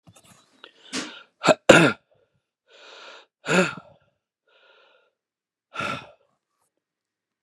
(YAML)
exhalation_length: 7.4 s
exhalation_amplitude: 32768
exhalation_signal_mean_std_ratio: 0.23
survey_phase: beta (2021-08-13 to 2022-03-07)
age: 45-64
gender: Male
wearing_mask: 'No'
symptom_abdominal_pain: true
smoker_status: Ex-smoker
respiratory_condition_asthma: false
respiratory_condition_other: false
recruitment_source: REACT
submission_delay: 2 days
covid_test_result: Negative
covid_test_method: RT-qPCR
influenza_a_test_result: Negative
influenza_b_test_result: Negative